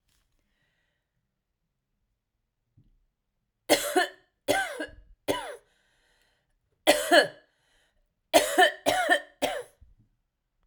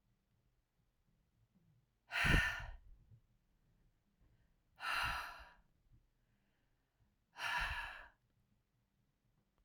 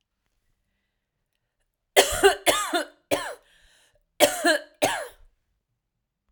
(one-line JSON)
{"three_cough_length": "10.7 s", "three_cough_amplitude": 19701, "three_cough_signal_mean_std_ratio": 0.31, "exhalation_length": "9.6 s", "exhalation_amplitude": 3536, "exhalation_signal_mean_std_ratio": 0.32, "cough_length": "6.3 s", "cough_amplitude": 31981, "cough_signal_mean_std_ratio": 0.33, "survey_phase": "alpha (2021-03-01 to 2021-08-12)", "age": "45-64", "gender": "Female", "wearing_mask": "No", "symptom_none": true, "smoker_status": "Never smoked", "respiratory_condition_asthma": false, "respiratory_condition_other": false, "recruitment_source": "REACT", "submission_delay": "1 day", "covid_test_result": "Negative", "covid_test_method": "RT-qPCR"}